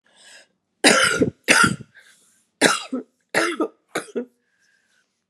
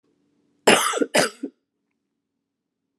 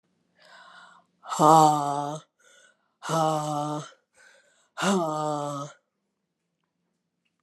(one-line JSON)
{"three_cough_length": "5.3 s", "three_cough_amplitude": 32695, "three_cough_signal_mean_std_ratio": 0.4, "cough_length": "3.0 s", "cough_amplitude": 28646, "cough_signal_mean_std_ratio": 0.31, "exhalation_length": "7.4 s", "exhalation_amplitude": 21516, "exhalation_signal_mean_std_ratio": 0.38, "survey_phase": "alpha (2021-03-01 to 2021-08-12)", "age": "45-64", "gender": "Female", "wearing_mask": "No", "symptom_cough_any": true, "symptom_shortness_of_breath": true, "symptom_diarrhoea": true, "symptom_fatigue": true, "symptom_change_to_sense_of_smell_or_taste": true, "symptom_loss_of_taste": true, "symptom_onset": "4 days", "smoker_status": "Never smoked", "respiratory_condition_asthma": true, "respiratory_condition_other": false, "recruitment_source": "Test and Trace", "submission_delay": "2 days", "covid_test_result": "Positive", "covid_test_method": "RT-qPCR", "covid_ct_value": 20.5, "covid_ct_gene": "ORF1ab gene", "covid_ct_mean": 21.4, "covid_viral_load": "96000 copies/ml", "covid_viral_load_category": "Low viral load (10K-1M copies/ml)"}